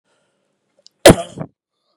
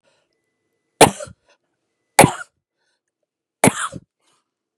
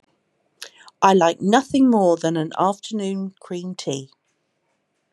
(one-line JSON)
{"cough_length": "2.0 s", "cough_amplitude": 32768, "cough_signal_mean_std_ratio": 0.21, "three_cough_length": "4.8 s", "three_cough_amplitude": 32768, "three_cough_signal_mean_std_ratio": 0.2, "exhalation_length": "5.1 s", "exhalation_amplitude": 29081, "exhalation_signal_mean_std_ratio": 0.5, "survey_phase": "beta (2021-08-13 to 2022-03-07)", "age": "45-64", "gender": "Female", "wearing_mask": "No", "symptom_none": true, "smoker_status": "Never smoked", "respiratory_condition_asthma": false, "respiratory_condition_other": false, "recruitment_source": "REACT", "submission_delay": "5 days", "covid_test_result": "Negative", "covid_test_method": "RT-qPCR", "influenza_a_test_result": "Negative", "influenza_b_test_result": "Negative"}